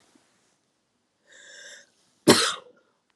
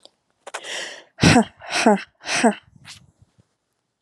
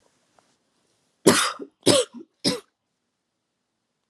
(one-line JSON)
{"cough_length": "3.2 s", "cough_amplitude": 24490, "cough_signal_mean_std_ratio": 0.22, "exhalation_length": "4.0 s", "exhalation_amplitude": 27976, "exhalation_signal_mean_std_ratio": 0.37, "three_cough_length": "4.1 s", "three_cough_amplitude": 31288, "three_cough_signal_mean_std_ratio": 0.28, "survey_phase": "beta (2021-08-13 to 2022-03-07)", "age": "18-44", "gender": "Female", "wearing_mask": "No", "symptom_cough_any": true, "symptom_new_continuous_cough": true, "symptom_runny_or_blocked_nose": true, "symptom_shortness_of_breath": true, "symptom_sore_throat": true, "symptom_fatigue": true, "symptom_headache": true, "symptom_change_to_sense_of_smell_or_taste": true, "symptom_onset": "3 days", "smoker_status": "Never smoked", "respiratory_condition_asthma": false, "respiratory_condition_other": false, "recruitment_source": "Test and Trace", "submission_delay": "1 day", "covid_test_result": "Positive", "covid_test_method": "RT-qPCR", "covid_ct_value": 27.4, "covid_ct_gene": "N gene"}